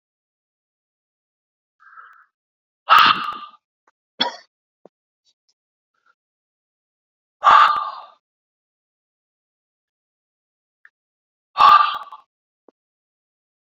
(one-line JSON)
{"exhalation_length": "13.7 s", "exhalation_amplitude": 30536, "exhalation_signal_mean_std_ratio": 0.23, "survey_phase": "beta (2021-08-13 to 2022-03-07)", "age": "18-44", "gender": "Male", "wearing_mask": "No", "symptom_cough_any": true, "symptom_new_continuous_cough": true, "symptom_runny_or_blocked_nose": true, "symptom_shortness_of_breath": true, "symptom_fatigue": true, "symptom_other": true, "symptom_onset": "3 days", "smoker_status": "Ex-smoker", "respiratory_condition_asthma": false, "respiratory_condition_other": false, "recruitment_source": "Test and Trace", "submission_delay": "2 days", "covid_test_result": "Positive", "covid_test_method": "ePCR"}